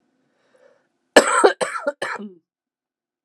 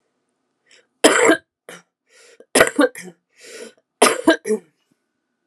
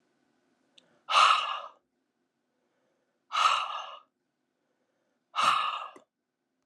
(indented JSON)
{
  "cough_length": "3.2 s",
  "cough_amplitude": 32768,
  "cough_signal_mean_std_ratio": 0.3,
  "three_cough_length": "5.5 s",
  "three_cough_amplitude": 32768,
  "three_cough_signal_mean_std_ratio": 0.33,
  "exhalation_length": "6.7 s",
  "exhalation_amplitude": 12735,
  "exhalation_signal_mean_std_ratio": 0.35,
  "survey_phase": "alpha (2021-03-01 to 2021-08-12)",
  "age": "45-64",
  "gender": "Female",
  "wearing_mask": "No",
  "symptom_cough_any": true,
  "symptom_change_to_sense_of_smell_or_taste": true,
  "symptom_loss_of_taste": true,
  "symptom_onset": "5 days",
  "smoker_status": "Current smoker (1 to 10 cigarettes per day)",
  "respiratory_condition_asthma": false,
  "respiratory_condition_other": false,
  "recruitment_source": "Test and Trace",
  "submission_delay": "2 days",
  "covid_test_result": "Positive",
  "covid_test_method": "RT-qPCR",
  "covid_ct_value": 21.6,
  "covid_ct_gene": "ORF1ab gene"
}